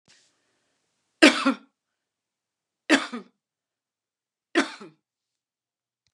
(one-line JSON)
{"three_cough_length": "6.1 s", "three_cough_amplitude": 31034, "three_cough_signal_mean_std_ratio": 0.21, "survey_phase": "beta (2021-08-13 to 2022-03-07)", "age": "45-64", "gender": "Female", "wearing_mask": "No", "symptom_none": true, "smoker_status": "Never smoked", "respiratory_condition_asthma": false, "respiratory_condition_other": false, "recruitment_source": "REACT", "submission_delay": "1 day", "covid_test_result": "Negative", "covid_test_method": "RT-qPCR"}